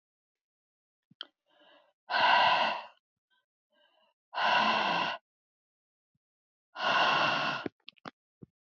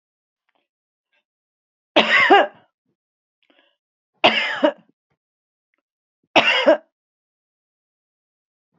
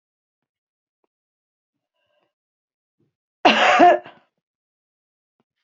{"exhalation_length": "8.6 s", "exhalation_amplitude": 8059, "exhalation_signal_mean_std_ratio": 0.44, "three_cough_length": "8.8 s", "three_cough_amplitude": 32730, "three_cough_signal_mean_std_ratio": 0.29, "cough_length": "5.6 s", "cough_amplitude": 27936, "cough_signal_mean_std_ratio": 0.24, "survey_phase": "beta (2021-08-13 to 2022-03-07)", "age": "65+", "gender": "Female", "wearing_mask": "No", "symptom_none": true, "smoker_status": "Never smoked", "respiratory_condition_asthma": false, "respiratory_condition_other": false, "recruitment_source": "REACT", "submission_delay": "11 days", "covid_test_result": "Negative", "covid_test_method": "RT-qPCR", "influenza_a_test_result": "Negative", "influenza_b_test_result": "Negative"}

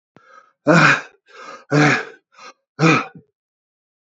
{"exhalation_length": "4.0 s", "exhalation_amplitude": 29195, "exhalation_signal_mean_std_ratio": 0.4, "survey_phase": "beta (2021-08-13 to 2022-03-07)", "age": "65+", "gender": "Male", "wearing_mask": "No", "symptom_none": true, "smoker_status": "Ex-smoker", "respiratory_condition_asthma": false, "respiratory_condition_other": false, "recruitment_source": "REACT", "submission_delay": "3 days", "covid_test_result": "Negative", "covid_test_method": "RT-qPCR", "influenza_a_test_result": "Negative", "influenza_b_test_result": "Negative"}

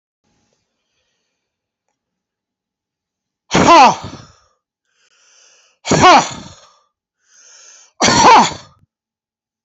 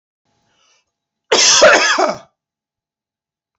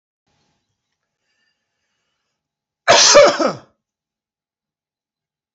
{"exhalation_length": "9.6 s", "exhalation_amplitude": 32579, "exhalation_signal_mean_std_ratio": 0.32, "three_cough_length": "3.6 s", "three_cough_amplitude": 32207, "three_cough_signal_mean_std_ratio": 0.39, "cough_length": "5.5 s", "cough_amplitude": 32767, "cough_signal_mean_std_ratio": 0.26, "survey_phase": "beta (2021-08-13 to 2022-03-07)", "age": "45-64", "gender": "Male", "wearing_mask": "No", "symptom_cough_any": true, "symptom_runny_or_blocked_nose": true, "symptom_shortness_of_breath": true, "symptom_onset": "6 days", "smoker_status": "Never smoked", "respiratory_condition_asthma": true, "respiratory_condition_other": false, "recruitment_source": "Test and Trace", "submission_delay": "2 days", "covid_test_result": "Positive", "covid_test_method": "RT-qPCR", "covid_ct_value": 18.2, "covid_ct_gene": "N gene", "covid_ct_mean": 19.3, "covid_viral_load": "470000 copies/ml", "covid_viral_load_category": "Low viral load (10K-1M copies/ml)"}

